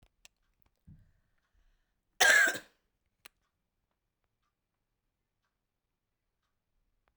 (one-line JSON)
{"cough_length": "7.2 s", "cough_amplitude": 16391, "cough_signal_mean_std_ratio": 0.18, "survey_phase": "beta (2021-08-13 to 2022-03-07)", "age": "18-44", "gender": "Female", "wearing_mask": "No", "symptom_cough_any": true, "symptom_runny_or_blocked_nose": true, "symptom_fatigue": true, "symptom_onset": "13 days", "smoker_status": "Never smoked", "respiratory_condition_asthma": false, "respiratory_condition_other": false, "recruitment_source": "REACT", "submission_delay": "1 day", "covid_test_result": "Negative", "covid_test_method": "RT-qPCR"}